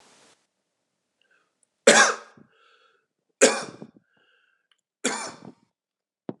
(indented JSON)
{
  "three_cough_length": "6.4 s",
  "three_cough_amplitude": 31146,
  "three_cough_signal_mean_std_ratio": 0.23,
  "survey_phase": "beta (2021-08-13 to 2022-03-07)",
  "age": "45-64",
  "gender": "Male",
  "wearing_mask": "No",
  "symptom_none": true,
  "smoker_status": "Current smoker (1 to 10 cigarettes per day)",
  "respiratory_condition_asthma": false,
  "respiratory_condition_other": false,
  "recruitment_source": "REACT",
  "submission_delay": "3 days",
  "covid_test_result": "Negative",
  "covid_test_method": "RT-qPCR",
  "influenza_a_test_result": "Negative",
  "influenza_b_test_result": "Negative"
}